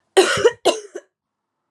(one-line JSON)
{"cough_length": "1.7 s", "cough_amplitude": 29805, "cough_signal_mean_std_ratio": 0.4, "survey_phase": "alpha (2021-03-01 to 2021-08-12)", "age": "18-44", "gender": "Female", "wearing_mask": "No", "symptom_cough_any": true, "symptom_fatigue": true, "symptom_headache": true, "symptom_change_to_sense_of_smell_or_taste": true, "symptom_loss_of_taste": true, "symptom_onset": "3 days", "smoker_status": "Current smoker (11 or more cigarettes per day)", "respiratory_condition_asthma": false, "respiratory_condition_other": false, "recruitment_source": "Test and Trace", "submission_delay": "1 day", "covid_test_result": "Positive", "covid_test_method": "RT-qPCR", "covid_ct_value": 13.6, "covid_ct_gene": "ORF1ab gene", "covid_ct_mean": 14.0, "covid_viral_load": "26000000 copies/ml", "covid_viral_load_category": "High viral load (>1M copies/ml)"}